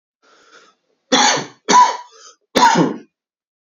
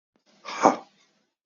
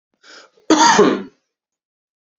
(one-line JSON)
{"three_cough_length": "3.8 s", "three_cough_amplitude": 29446, "three_cough_signal_mean_std_ratio": 0.42, "exhalation_length": "1.5 s", "exhalation_amplitude": 27750, "exhalation_signal_mean_std_ratio": 0.25, "cough_length": "2.4 s", "cough_amplitude": 31552, "cough_signal_mean_std_ratio": 0.38, "survey_phase": "beta (2021-08-13 to 2022-03-07)", "age": "18-44", "gender": "Male", "wearing_mask": "No", "symptom_sore_throat": true, "symptom_headache": true, "symptom_onset": "2 days", "smoker_status": "Ex-smoker", "respiratory_condition_asthma": false, "respiratory_condition_other": false, "recruitment_source": "Test and Trace", "submission_delay": "2 days", "covid_test_result": "Positive", "covid_test_method": "ePCR"}